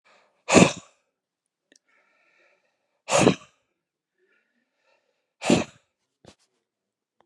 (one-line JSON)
{"exhalation_length": "7.3 s", "exhalation_amplitude": 30623, "exhalation_signal_mean_std_ratio": 0.22, "survey_phase": "beta (2021-08-13 to 2022-03-07)", "age": "45-64", "gender": "Male", "wearing_mask": "No", "symptom_none": true, "smoker_status": "Ex-smoker", "respiratory_condition_asthma": false, "respiratory_condition_other": true, "recruitment_source": "REACT", "submission_delay": "0 days", "covid_test_result": "Negative", "covid_test_method": "RT-qPCR"}